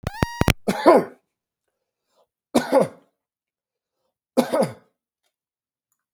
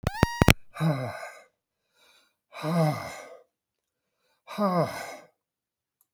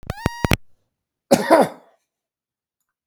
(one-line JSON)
{"three_cough_length": "6.1 s", "three_cough_amplitude": 32768, "three_cough_signal_mean_std_ratio": 0.29, "exhalation_length": "6.1 s", "exhalation_amplitude": 32768, "exhalation_signal_mean_std_ratio": 0.36, "cough_length": "3.1 s", "cough_amplitude": 32740, "cough_signal_mean_std_ratio": 0.29, "survey_phase": "beta (2021-08-13 to 2022-03-07)", "age": "45-64", "gender": "Male", "wearing_mask": "No", "symptom_none": true, "smoker_status": "Never smoked", "respiratory_condition_asthma": false, "respiratory_condition_other": false, "recruitment_source": "REACT", "submission_delay": "3 days", "covid_test_result": "Negative", "covid_test_method": "RT-qPCR", "influenza_a_test_result": "Negative", "influenza_b_test_result": "Negative"}